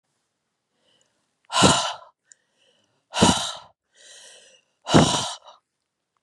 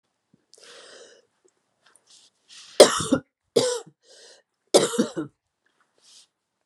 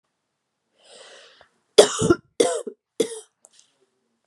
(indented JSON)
{
  "exhalation_length": "6.2 s",
  "exhalation_amplitude": 29315,
  "exhalation_signal_mean_std_ratio": 0.32,
  "three_cough_length": "6.7 s",
  "three_cough_amplitude": 32768,
  "three_cough_signal_mean_std_ratio": 0.24,
  "cough_length": "4.3 s",
  "cough_amplitude": 32768,
  "cough_signal_mean_std_ratio": 0.25,
  "survey_phase": "beta (2021-08-13 to 2022-03-07)",
  "age": "45-64",
  "gender": "Female",
  "wearing_mask": "No",
  "symptom_cough_any": true,
  "symptom_runny_or_blocked_nose": true,
  "symptom_headache": true,
  "symptom_change_to_sense_of_smell_or_taste": true,
  "symptom_loss_of_taste": true,
  "symptom_other": true,
  "symptom_onset": "4 days",
  "smoker_status": "Never smoked",
  "respiratory_condition_asthma": false,
  "respiratory_condition_other": false,
  "recruitment_source": "Test and Trace",
  "submission_delay": "1 day",
  "covid_test_result": "Positive",
  "covid_test_method": "RT-qPCR",
  "covid_ct_value": 29.4,
  "covid_ct_gene": "N gene"
}